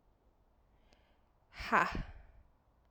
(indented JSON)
{
  "exhalation_length": "2.9 s",
  "exhalation_amplitude": 6706,
  "exhalation_signal_mean_std_ratio": 0.29,
  "survey_phase": "alpha (2021-03-01 to 2021-08-12)",
  "age": "18-44",
  "gender": "Female",
  "wearing_mask": "No",
  "symptom_cough_any": true,
  "symptom_new_continuous_cough": true,
  "symptom_shortness_of_breath": true,
  "symptom_abdominal_pain": true,
  "symptom_diarrhoea": true,
  "symptom_fatigue": true,
  "symptom_fever_high_temperature": true,
  "symptom_headache": true,
  "symptom_change_to_sense_of_smell_or_taste": true,
  "symptom_loss_of_taste": true,
  "symptom_onset": "2 days",
  "smoker_status": "Never smoked",
  "respiratory_condition_asthma": false,
  "respiratory_condition_other": false,
  "recruitment_source": "Test and Trace",
  "submission_delay": "2 days",
  "covid_test_result": "Positive",
  "covid_test_method": "RT-qPCR",
  "covid_ct_value": 22.9,
  "covid_ct_gene": "ORF1ab gene",
  "covid_ct_mean": 23.9,
  "covid_viral_load": "14000 copies/ml",
  "covid_viral_load_category": "Low viral load (10K-1M copies/ml)"
}